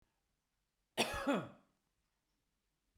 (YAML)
cough_length: 3.0 s
cough_amplitude: 3726
cough_signal_mean_std_ratio: 0.3
survey_phase: beta (2021-08-13 to 2022-03-07)
age: 45-64
gender: Male
wearing_mask: 'No'
symptom_none: true
smoker_status: Ex-smoker
respiratory_condition_asthma: false
respiratory_condition_other: false
recruitment_source: REACT
submission_delay: 1 day
covid_test_result: Negative
covid_test_method: RT-qPCR